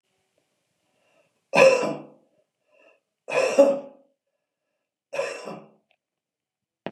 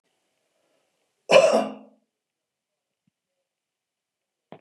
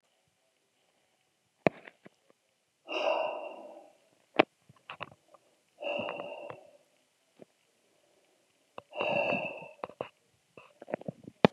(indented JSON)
{
  "three_cough_length": "6.9 s",
  "three_cough_amplitude": 24230,
  "three_cough_signal_mean_std_ratio": 0.29,
  "cough_length": "4.6 s",
  "cough_amplitude": 24748,
  "cough_signal_mean_std_ratio": 0.22,
  "exhalation_length": "11.5 s",
  "exhalation_amplitude": 28637,
  "exhalation_signal_mean_std_ratio": 0.27,
  "survey_phase": "beta (2021-08-13 to 2022-03-07)",
  "age": "65+",
  "gender": "Male",
  "wearing_mask": "No",
  "symptom_cough_any": true,
  "smoker_status": "Never smoked",
  "respiratory_condition_asthma": false,
  "respiratory_condition_other": false,
  "recruitment_source": "REACT",
  "submission_delay": "2 days",
  "covid_test_result": "Negative",
  "covid_test_method": "RT-qPCR",
  "influenza_a_test_result": "Unknown/Void",
  "influenza_b_test_result": "Unknown/Void"
}